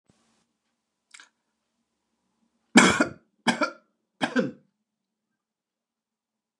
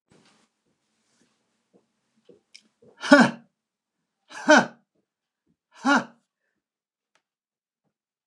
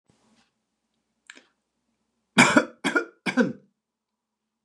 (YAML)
three_cough_length: 6.6 s
three_cough_amplitude: 26795
three_cough_signal_mean_std_ratio: 0.23
exhalation_length: 8.3 s
exhalation_amplitude: 29203
exhalation_signal_mean_std_ratio: 0.2
cough_length: 4.6 s
cough_amplitude: 28969
cough_signal_mean_std_ratio: 0.26
survey_phase: alpha (2021-03-01 to 2021-08-12)
age: 45-64
gender: Male
wearing_mask: 'No'
symptom_none: true
symptom_onset: 7 days
smoker_status: Never smoked
respiratory_condition_asthma: false
respiratory_condition_other: false
recruitment_source: REACT
submission_delay: 2 days
covid_test_result: Negative
covid_test_method: RT-qPCR